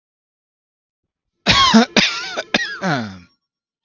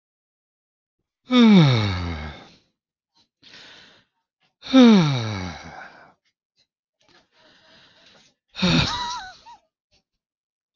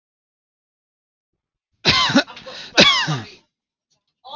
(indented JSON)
{
  "cough_length": "3.8 s",
  "cough_amplitude": 32767,
  "cough_signal_mean_std_ratio": 0.41,
  "exhalation_length": "10.8 s",
  "exhalation_amplitude": 24918,
  "exhalation_signal_mean_std_ratio": 0.35,
  "three_cough_length": "4.4 s",
  "three_cough_amplitude": 32654,
  "three_cough_signal_mean_std_ratio": 0.34,
  "survey_phase": "beta (2021-08-13 to 2022-03-07)",
  "age": "18-44",
  "gender": "Male",
  "wearing_mask": "No",
  "symptom_none": true,
  "symptom_onset": "13 days",
  "smoker_status": "Never smoked",
  "respiratory_condition_asthma": false,
  "respiratory_condition_other": false,
  "recruitment_source": "REACT",
  "submission_delay": "0 days",
  "covid_test_result": "Negative",
  "covid_test_method": "RT-qPCR",
  "influenza_a_test_result": "Negative",
  "influenza_b_test_result": "Negative"
}